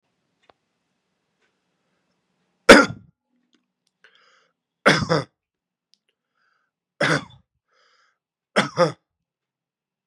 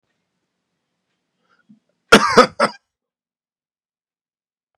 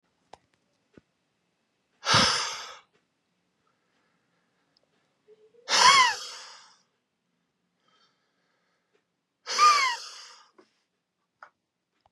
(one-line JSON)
{"three_cough_length": "10.1 s", "three_cough_amplitude": 32768, "three_cough_signal_mean_std_ratio": 0.19, "cough_length": "4.8 s", "cough_amplitude": 32768, "cough_signal_mean_std_ratio": 0.2, "exhalation_length": "12.1 s", "exhalation_amplitude": 20943, "exhalation_signal_mean_std_ratio": 0.27, "survey_phase": "beta (2021-08-13 to 2022-03-07)", "age": "18-44", "gender": "Male", "wearing_mask": "No", "symptom_headache": true, "smoker_status": "Never smoked", "respiratory_condition_asthma": false, "respiratory_condition_other": false, "recruitment_source": "Test and Trace", "submission_delay": "1 day", "covid_test_result": "Positive", "covid_test_method": "RT-qPCR", "covid_ct_value": 25.8, "covid_ct_gene": "ORF1ab gene"}